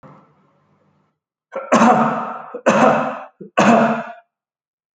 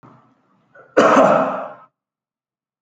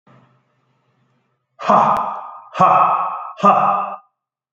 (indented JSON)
{
  "three_cough_length": "4.9 s",
  "three_cough_amplitude": 30308,
  "three_cough_signal_mean_std_ratio": 0.48,
  "cough_length": "2.8 s",
  "cough_amplitude": 32313,
  "cough_signal_mean_std_ratio": 0.39,
  "exhalation_length": "4.5 s",
  "exhalation_amplitude": 29256,
  "exhalation_signal_mean_std_ratio": 0.5,
  "survey_phase": "alpha (2021-03-01 to 2021-08-12)",
  "age": "45-64",
  "gender": "Male",
  "wearing_mask": "No",
  "symptom_none": true,
  "symptom_onset": "11 days",
  "smoker_status": "Never smoked",
  "respiratory_condition_asthma": false,
  "respiratory_condition_other": false,
  "recruitment_source": "REACT",
  "submission_delay": "3 days",
  "covid_test_result": "Negative",
  "covid_test_method": "RT-qPCR"
}